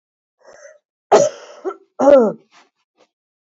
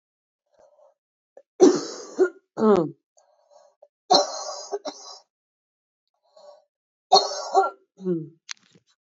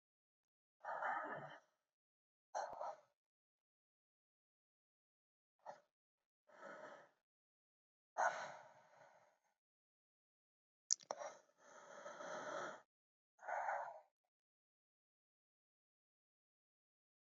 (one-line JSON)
{"cough_length": "3.5 s", "cough_amplitude": 28267, "cough_signal_mean_std_ratio": 0.33, "three_cough_length": "9.0 s", "three_cough_amplitude": 25982, "three_cough_signal_mean_std_ratio": 0.32, "exhalation_length": "17.3 s", "exhalation_amplitude": 3670, "exhalation_signal_mean_std_ratio": 0.31, "survey_phase": "beta (2021-08-13 to 2022-03-07)", "age": "18-44", "gender": "Female", "wearing_mask": "No", "symptom_shortness_of_breath": true, "symptom_change_to_sense_of_smell_or_taste": true, "symptom_loss_of_taste": true, "symptom_other": true, "symptom_onset": "3 days", "smoker_status": "Ex-smoker", "respiratory_condition_asthma": false, "respiratory_condition_other": false, "recruitment_source": "Test and Trace", "submission_delay": "2 days", "covid_test_result": "Positive", "covid_test_method": "RT-qPCR", "covid_ct_value": 15.6, "covid_ct_gene": "ORF1ab gene", "covid_ct_mean": 16.1, "covid_viral_load": "5300000 copies/ml", "covid_viral_load_category": "High viral load (>1M copies/ml)"}